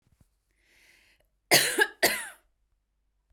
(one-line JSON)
{"cough_length": "3.3 s", "cough_amplitude": 19749, "cough_signal_mean_std_ratio": 0.3, "survey_phase": "beta (2021-08-13 to 2022-03-07)", "age": "18-44", "gender": "Female", "wearing_mask": "No", "symptom_cough_any": true, "symptom_sore_throat": true, "symptom_fatigue": true, "symptom_onset": "23 days", "smoker_status": "Never smoked", "respiratory_condition_asthma": true, "respiratory_condition_other": false, "recruitment_source": "Test and Trace", "submission_delay": "2 days", "covid_test_result": "Negative", "covid_test_method": "RT-qPCR"}